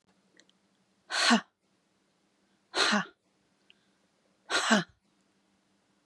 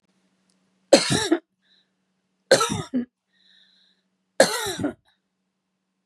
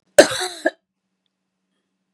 exhalation_length: 6.1 s
exhalation_amplitude: 11369
exhalation_signal_mean_std_ratio: 0.3
three_cough_length: 6.1 s
three_cough_amplitude: 32178
three_cough_signal_mean_std_ratio: 0.3
cough_length: 2.1 s
cough_amplitude: 32768
cough_signal_mean_std_ratio: 0.22
survey_phase: beta (2021-08-13 to 2022-03-07)
age: 65+
gender: Female
wearing_mask: 'No'
symptom_none: true
smoker_status: Ex-smoker
respiratory_condition_asthma: false
respiratory_condition_other: false
recruitment_source: REACT
submission_delay: 2 days
covid_test_result: Negative
covid_test_method: RT-qPCR
influenza_a_test_result: Negative
influenza_b_test_result: Negative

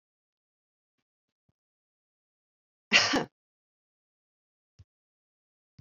cough_length: 5.8 s
cough_amplitude: 15735
cough_signal_mean_std_ratio: 0.17
survey_phase: beta (2021-08-13 to 2022-03-07)
age: 65+
gender: Female
wearing_mask: 'No'
symptom_none: true
smoker_status: Never smoked
respiratory_condition_asthma: false
respiratory_condition_other: false
recruitment_source: REACT
submission_delay: 1 day
covid_test_result: Negative
covid_test_method: RT-qPCR
influenza_a_test_result: Negative
influenza_b_test_result: Negative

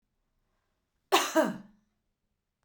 cough_length: 2.6 s
cough_amplitude: 10666
cough_signal_mean_std_ratio: 0.28
survey_phase: beta (2021-08-13 to 2022-03-07)
age: 45-64
gender: Female
wearing_mask: 'No'
symptom_none: true
smoker_status: Never smoked
respiratory_condition_asthma: false
respiratory_condition_other: false
recruitment_source: REACT
submission_delay: 2 days
covid_test_result: Negative
covid_test_method: RT-qPCR
influenza_a_test_result: Negative
influenza_b_test_result: Negative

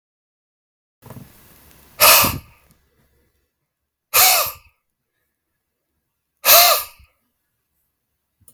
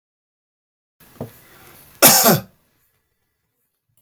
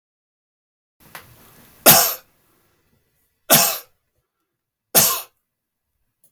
exhalation_length: 8.5 s
exhalation_amplitude: 32768
exhalation_signal_mean_std_ratio: 0.28
cough_length: 4.0 s
cough_amplitude: 32768
cough_signal_mean_std_ratio: 0.26
three_cough_length: 6.3 s
three_cough_amplitude: 32768
three_cough_signal_mean_std_ratio: 0.27
survey_phase: beta (2021-08-13 to 2022-03-07)
age: 18-44
gender: Male
wearing_mask: 'No'
symptom_none: true
symptom_onset: 7 days
smoker_status: Never smoked
respiratory_condition_asthma: false
respiratory_condition_other: false
recruitment_source: REACT
submission_delay: 1 day
covid_test_result: Negative
covid_test_method: RT-qPCR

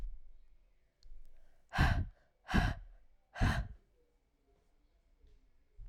exhalation_length: 5.9 s
exhalation_amplitude: 5025
exhalation_signal_mean_std_ratio: 0.38
survey_phase: alpha (2021-03-01 to 2021-08-12)
age: 18-44
gender: Female
wearing_mask: 'No'
symptom_cough_any: true
symptom_new_continuous_cough: true
symptom_abdominal_pain: true
symptom_fatigue: true
symptom_fever_high_temperature: true
symptom_headache: true
smoker_status: Never smoked
respiratory_condition_asthma: false
respiratory_condition_other: false
recruitment_source: Test and Trace
submission_delay: 2 days
covid_test_result: Positive
covid_test_method: RT-qPCR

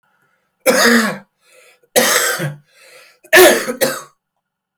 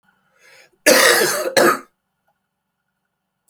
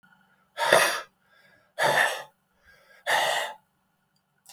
three_cough_length: 4.8 s
three_cough_amplitude: 32768
three_cough_signal_mean_std_ratio: 0.46
cough_length: 3.5 s
cough_amplitude: 32768
cough_signal_mean_std_ratio: 0.39
exhalation_length: 4.5 s
exhalation_amplitude: 27123
exhalation_signal_mean_std_ratio: 0.42
survey_phase: beta (2021-08-13 to 2022-03-07)
age: 45-64
gender: Male
wearing_mask: 'No'
symptom_cough_any: true
symptom_runny_or_blocked_nose: true
symptom_fatigue: true
symptom_fever_high_temperature: true
symptom_headache: true
symptom_change_to_sense_of_smell_or_taste: true
symptom_onset: 3 days
smoker_status: Ex-smoker
respiratory_condition_asthma: false
respiratory_condition_other: false
recruitment_source: Test and Trace
submission_delay: 1 day
covid_test_result: Positive
covid_test_method: RT-qPCR
covid_ct_value: 15.7
covid_ct_gene: ORF1ab gene
covid_ct_mean: 16.1
covid_viral_load: 5400000 copies/ml
covid_viral_load_category: High viral load (>1M copies/ml)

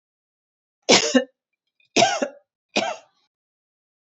three_cough_length: 4.0 s
three_cough_amplitude: 29040
three_cough_signal_mean_std_ratio: 0.32
survey_phase: beta (2021-08-13 to 2022-03-07)
age: 45-64
gender: Female
wearing_mask: 'No'
symptom_cough_any: true
symptom_sore_throat: true
smoker_status: Ex-smoker
respiratory_condition_asthma: false
respiratory_condition_other: false
recruitment_source: Test and Trace
submission_delay: 2 days
covid_test_result: Negative
covid_test_method: RT-qPCR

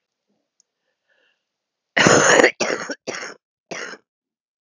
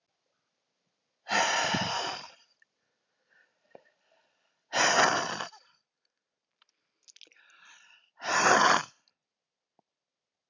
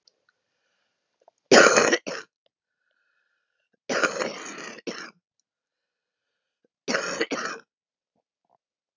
cough_length: 4.6 s
cough_amplitude: 32768
cough_signal_mean_std_ratio: 0.33
exhalation_length: 10.5 s
exhalation_amplitude: 13721
exhalation_signal_mean_std_ratio: 0.35
three_cough_length: 9.0 s
three_cough_amplitude: 27793
three_cough_signal_mean_std_ratio: 0.27
survey_phase: beta (2021-08-13 to 2022-03-07)
age: 45-64
gender: Female
wearing_mask: 'No'
symptom_cough_any: true
symptom_runny_or_blocked_nose: true
symptom_sore_throat: true
symptom_abdominal_pain: true
symptom_diarrhoea: true
symptom_headache: true
symptom_onset: 12 days
smoker_status: Current smoker (1 to 10 cigarettes per day)
respiratory_condition_asthma: false
respiratory_condition_other: true
recruitment_source: REACT
submission_delay: 10 days
covid_test_result: Negative
covid_test_method: RT-qPCR
influenza_a_test_result: Unknown/Void
influenza_b_test_result: Unknown/Void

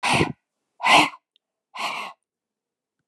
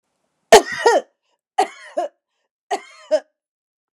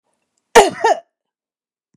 exhalation_length: 3.1 s
exhalation_amplitude: 26893
exhalation_signal_mean_std_ratio: 0.37
three_cough_length: 3.9 s
three_cough_amplitude: 29204
three_cough_signal_mean_std_ratio: 0.29
cough_length: 2.0 s
cough_amplitude: 29204
cough_signal_mean_std_ratio: 0.29
survey_phase: beta (2021-08-13 to 2022-03-07)
age: 65+
gender: Female
wearing_mask: 'No'
symptom_none: true
symptom_onset: 12 days
smoker_status: Ex-smoker
respiratory_condition_asthma: false
respiratory_condition_other: false
recruitment_source: REACT
submission_delay: 1 day
covid_test_result: Negative
covid_test_method: RT-qPCR
influenza_a_test_result: Negative
influenza_b_test_result: Negative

